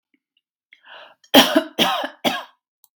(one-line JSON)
{"cough_length": "3.0 s", "cough_amplitude": 32768, "cough_signal_mean_std_ratio": 0.34, "survey_phase": "beta (2021-08-13 to 2022-03-07)", "age": "45-64", "gender": "Female", "wearing_mask": "No", "symptom_none": true, "smoker_status": "Ex-smoker", "respiratory_condition_asthma": false, "respiratory_condition_other": false, "recruitment_source": "REACT", "submission_delay": "0 days", "covid_test_result": "Negative", "covid_test_method": "RT-qPCR", "influenza_a_test_result": "Negative", "influenza_b_test_result": "Negative"}